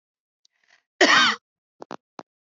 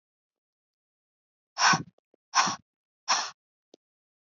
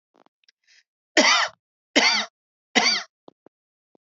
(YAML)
cough_length: 2.5 s
cough_amplitude: 23701
cough_signal_mean_std_ratio: 0.3
exhalation_length: 4.4 s
exhalation_amplitude: 11696
exhalation_signal_mean_std_ratio: 0.28
three_cough_length: 4.1 s
three_cough_amplitude: 26222
three_cough_signal_mean_std_ratio: 0.36
survey_phase: beta (2021-08-13 to 2022-03-07)
age: 45-64
gender: Female
wearing_mask: 'No'
symptom_fatigue: true
symptom_change_to_sense_of_smell_or_taste: true
symptom_onset: 12 days
smoker_status: Never smoked
respiratory_condition_asthma: false
respiratory_condition_other: false
recruitment_source: REACT
submission_delay: 1 day
covid_test_result: Negative
covid_test_method: RT-qPCR
influenza_a_test_result: Negative
influenza_b_test_result: Negative